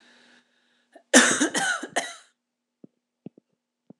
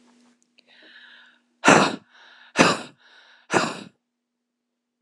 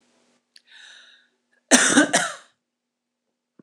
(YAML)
three_cough_length: 4.0 s
three_cough_amplitude: 26027
three_cough_signal_mean_std_ratio: 0.3
exhalation_length: 5.0 s
exhalation_amplitude: 26028
exhalation_signal_mean_std_ratio: 0.28
cough_length: 3.6 s
cough_amplitude: 26028
cough_signal_mean_std_ratio: 0.3
survey_phase: beta (2021-08-13 to 2022-03-07)
age: 18-44
gender: Female
wearing_mask: 'No'
symptom_none: true
smoker_status: Ex-smoker
respiratory_condition_asthma: true
respiratory_condition_other: false
recruitment_source: REACT
submission_delay: 2 days
covid_test_result: Negative
covid_test_method: RT-qPCR
influenza_a_test_result: Unknown/Void
influenza_b_test_result: Unknown/Void